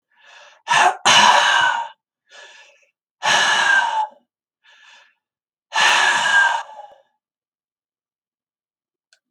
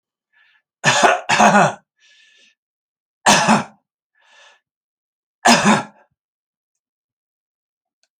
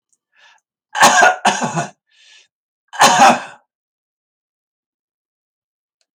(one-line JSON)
{"exhalation_length": "9.3 s", "exhalation_amplitude": 30302, "exhalation_signal_mean_std_ratio": 0.47, "three_cough_length": "8.2 s", "three_cough_amplitude": 32083, "three_cough_signal_mean_std_ratio": 0.34, "cough_length": "6.1 s", "cough_amplitude": 32768, "cough_signal_mean_std_ratio": 0.34, "survey_phase": "alpha (2021-03-01 to 2021-08-12)", "age": "65+", "gender": "Male", "wearing_mask": "No", "symptom_none": true, "smoker_status": "Never smoked", "respiratory_condition_asthma": false, "respiratory_condition_other": false, "recruitment_source": "REACT", "submission_delay": "2 days", "covid_test_result": "Negative", "covid_test_method": "RT-qPCR"}